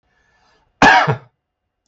{"cough_length": "1.9 s", "cough_amplitude": 32768, "cough_signal_mean_std_ratio": 0.34, "survey_phase": "beta (2021-08-13 to 2022-03-07)", "age": "65+", "gender": "Male", "wearing_mask": "No", "symptom_none": true, "smoker_status": "Never smoked", "respiratory_condition_asthma": false, "respiratory_condition_other": false, "recruitment_source": "REACT", "submission_delay": "0 days", "covid_test_result": "Negative", "covid_test_method": "RT-qPCR", "influenza_a_test_result": "Negative", "influenza_b_test_result": "Negative"}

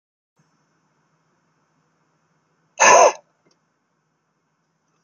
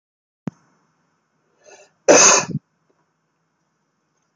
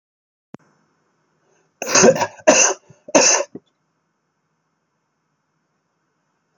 {"exhalation_length": "5.0 s", "exhalation_amplitude": 30746, "exhalation_signal_mean_std_ratio": 0.21, "cough_length": "4.4 s", "cough_amplitude": 31336, "cough_signal_mean_std_ratio": 0.25, "three_cough_length": "6.6 s", "three_cough_amplitude": 31911, "three_cough_signal_mean_std_ratio": 0.3, "survey_phase": "beta (2021-08-13 to 2022-03-07)", "age": "45-64", "gender": "Male", "wearing_mask": "No", "symptom_none": true, "symptom_onset": "5 days", "smoker_status": "Never smoked", "respiratory_condition_asthma": false, "respiratory_condition_other": false, "recruitment_source": "REACT", "submission_delay": "28 days", "covid_test_result": "Negative", "covid_test_method": "RT-qPCR"}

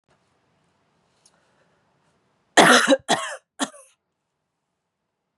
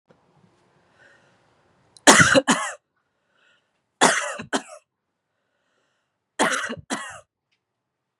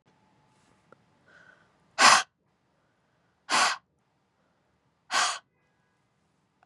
{"cough_length": "5.4 s", "cough_amplitude": 32475, "cough_signal_mean_std_ratio": 0.25, "three_cough_length": "8.2 s", "three_cough_amplitude": 32768, "three_cough_signal_mean_std_ratio": 0.28, "exhalation_length": "6.7 s", "exhalation_amplitude": 21890, "exhalation_signal_mean_std_ratio": 0.24, "survey_phase": "beta (2021-08-13 to 2022-03-07)", "age": "18-44", "gender": "Female", "wearing_mask": "No", "symptom_cough_any": true, "symptom_runny_or_blocked_nose": true, "symptom_shortness_of_breath": true, "symptom_fatigue": true, "symptom_change_to_sense_of_smell_or_taste": true, "symptom_loss_of_taste": true, "symptom_other": true, "symptom_onset": "4 days", "smoker_status": "Never smoked", "respiratory_condition_asthma": false, "respiratory_condition_other": false, "recruitment_source": "Test and Trace", "submission_delay": "2 days", "covid_test_result": "Positive", "covid_test_method": "RT-qPCR", "covid_ct_value": 14.0, "covid_ct_gene": "ORF1ab gene", "covid_ct_mean": 14.7, "covid_viral_load": "15000000 copies/ml", "covid_viral_load_category": "High viral load (>1M copies/ml)"}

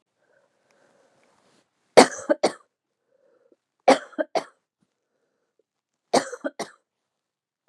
{"three_cough_length": "7.7 s", "three_cough_amplitude": 32759, "three_cough_signal_mean_std_ratio": 0.19, "survey_phase": "beta (2021-08-13 to 2022-03-07)", "age": "45-64", "gender": "Female", "wearing_mask": "No", "symptom_cough_any": true, "symptom_runny_or_blocked_nose": true, "symptom_sore_throat": true, "symptom_abdominal_pain": true, "symptom_fatigue": true, "symptom_headache": true, "smoker_status": "Never smoked", "respiratory_condition_asthma": false, "respiratory_condition_other": false, "recruitment_source": "Test and Trace", "submission_delay": "1 day", "covid_test_result": "Positive", "covid_test_method": "ePCR"}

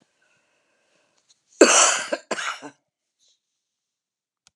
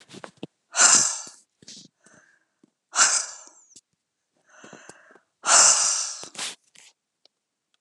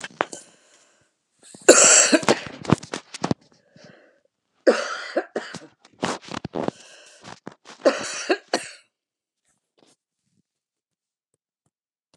{"cough_length": "4.6 s", "cough_amplitude": 32234, "cough_signal_mean_std_ratio": 0.26, "exhalation_length": "7.8 s", "exhalation_amplitude": 26836, "exhalation_signal_mean_std_ratio": 0.34, "three_cough_length": "12.2 s", "three_cough_amplitude": 32768, "three_cough_signal_mean_std_ratio": 0.28, "survey_phase": "beta (2021-08-13 to 2022-03-07)", "age": "65+", "gender": "Female", "wearing_mask": "No", "symptom_none": true, "smoker_status": "Current smoker (11 or more cigarettes per day)", "respiratory_condition_asthma": false, "respiratory_condition_other": false, "recruitment_source": "REACT", "submission_delay": "9 days", "covid_test_result": "Negative", "covid_test_method": "RT-qPCR"}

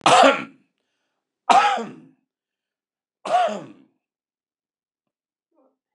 {"three_cough_length": "5.9 s", "three_cough_amplitude": 29203, "three_cough_signal_mean_std_ratio": 0.31, "survey_phase": "beta (2021-08-13 to 2022-03-07)", "age": "65+", "gender": "Male", "wearing_mask": "No", "symptom_cough_any": true, "symptom_runny_or_blocked_nose": true, "symptom_onset": "12 days", "smoker_status": "Never smoked", "respiratory_condition_asthma": false, "respiratory_condition_other": false, "recruitment_source": "REACT", "submission_delay": "1 day", "covid_test_result": "Negative", "covid_test_method": "RT-qPCR", "influenza_a_test_result": "Negative", "influenza_b_test_result": "Negative"}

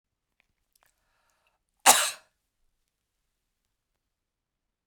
{"cough_length": "4.9 s", "cough_amplitude": 27467, "cough_signal_mean_std_ratio": 0.15, "survey_phase": "beta (2021-08-13 to 2022-03-07)", "age": "65+", "gender": "Female", "wearing_mask": "No", "symptom_none": true, "smoker_status": "Never smoked", "respiratory_condition_asthma": false, "respiratory_condition_other": false, "recruitment_source": "Test and Trace", "submission_delay": "2 days", "covid_test_result": "Negative", "covid_test_method": "LFT"}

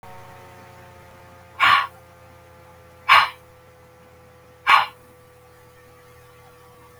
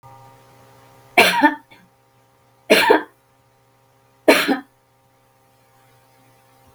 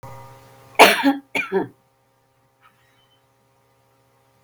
{"exhalation_length": "7.0 s", "exhalation_amplitude": 32532, "exhalation_signal_mean_std_ratio": 0.29, "three_cough_length": "6.7 s", "three_cough_amplitude": 32768, "three_cough_signal_mean_std_ratio": 0.3, "cough_length": "4.4 s", "cough_amplitude": 32768, "cough_signal_mean_std_ratio": 0.26, "survey_phase": "beta (2021-08-13 to 2022-03-07)", "age": "65+", "gender": "Female", "wearing_mask": "No", "symptom_none": true, "smoker_status": "Never smoked", "respiratory_condition_asthma": false, "respiratory_condition_other": false, "recruitment_source": "REACT", "submission_delay": "1 day", "covid_test_result": "Negative", "covid_test_method": "RT-qPCR", "covid_ct_value": 43.0, "covid_ct_gene": "N gene"}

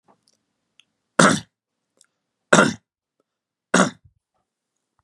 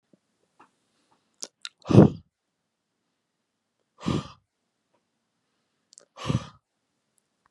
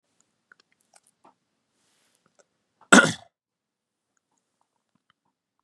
{"three_cough_length": "5.0 s", "three_cough_amplitude": 32767, "three_cough_signal_mean_std_ratio": 0.24, "exhalation_length": "7.5 s", "exhalation_amplitude": 28952, "exhalation_signal_mean_std_ratio": 0.17, "cough_length": "5.6 s", "cough_amplitude": 32687, "cough_signal_mean_std_ratio": 0.13, "survey_phase": "beta (2021-08-13 to 2022-03-07)", "age": "18-44", "gender": "Male", "wearing_mask": "No", "symptom_none": true, "smoker_status": "Never smoked", "respiratory_condition_asthma": true, "respiratory_condition_other": false, "recruitment_source": "REACT", "submission_delay": "1 day", "covid_test_result": "Negative", "covid_test_method": "RT-qPCR", "influenza_a_test_result": "Negative", "influenza_b_test_result": "Negative"}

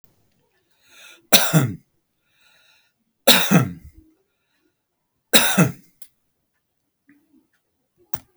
{"three_cough_length": "8.4 s", "three_cough_amplitude": 32768, "three_cough_signal_mean_std_ratio": 0.28, "survey_phase": "beta (2021-08-13 to 2022-03-07)", "age": "65+", "gender": "Male", "wearing_mask": "No", "symptom_none": true, "smoker_status": "Never smoked", "respiratory_condition_asthma": false, "respiratory_condition_other": true, "recruitment_source": "REACT", "submission_delay": "2 days", "covid_test_result": "Negative", "covid_test_method": "RT-qPCR"}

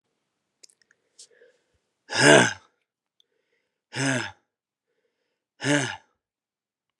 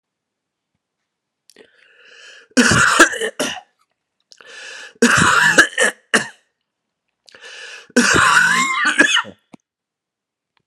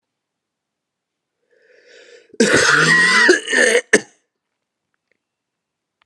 {"exhalation_length": "7.0 s", "exhalation_amplitude": 29807, "exhalation_signal_mean_std_ratio": 0.25, "three_cough_length": "10.7 s", "three_cough_amplitude": 32768, "three_cough_signal_mean_std_ratio": 0.44, "cough_length": "6.1 s", "cough_amplitude": 32767, "cough_signal_mean_std_ratio": 0.41, "survey_phase": "alpha (2021-03-01 to 2021-08-12)", "age": "18-44", "gender": "Male", "wearing_mask": "No", "symptom_cough_any": true, "symptom_new_continuous_cough": true, "symptom_fatigue": true, "symptom_fever_high_temperature": true, "symptom_headache": true, "symptom_onset": "2 days", "smoker_status": "Never smoked", "respiratory_condition_asthma": false, "respiratory_condition_other": false, "recruitment_source": "Test and Trace", "submission_delay": "1 day", "covid_test_result": "Positive", "covid_test_method": "RT-qPCR"}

